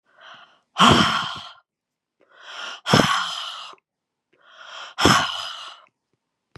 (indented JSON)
{
  "exhalation_length": "6.6 s",
  "exhalation_amplitude": 32699,
  "exhalation_signal_mean_std_ratio": 0.39,
  "survey_phase": "beta (2021-08-13 to 2022-03-07)",
  "age": "65+",
  "gender": "Female",
  "wearing_mask": "No",
  "symptom_cough_any": true,
  "symptom_runny_or_blocked_nose": true,
  "symptom_fatigue": true,
  "symptom_onset": "3 days",
  "smoker_status": "Never smoked",
  "respiratory_condition_asthma": false,
  "respiratory_condition_other": false,
  "recruitment_source": "Test and Trace",
  "submission_delay": "1 day",
  "covid_test_result": "Positive",
  "covid_test_method": "ePCR"
}